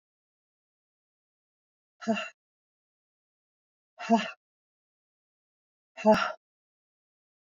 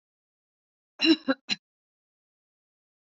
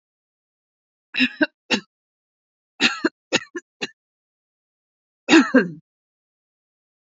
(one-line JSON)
{"exhalation_length": "7.4 s", "exhalation_amplitude": 10424, "exhalation_signal_mean_std_ratio": 0.21, "cough_length": "3.1 s", "cough_amplitude": 12580, "cough_signal_mean_std_ratio": 0.22, "three_cough_length": "7.2 s", "three_cough_amplitude": 26527, "three_cough_signal_mean_std_ratio": 0.26, "survey_phase": "beta (2021-08-13 to 2022-03-07)", "age": "45-64", "gender": "Female", "wearing_mask": "No", "symptom_none": true, "smoker_status": "Never smoked", "respiratory_condition_asthma": false, "respiratory_condition_other": false, "recruitment_source": "REACT", "submission_delay": "2 days", "covid_test_result": "Negative", "covid_test_method": "RT-qPCR", "influenza_a_test_result": "Negative", "influenza_b_test_result": "Negative"}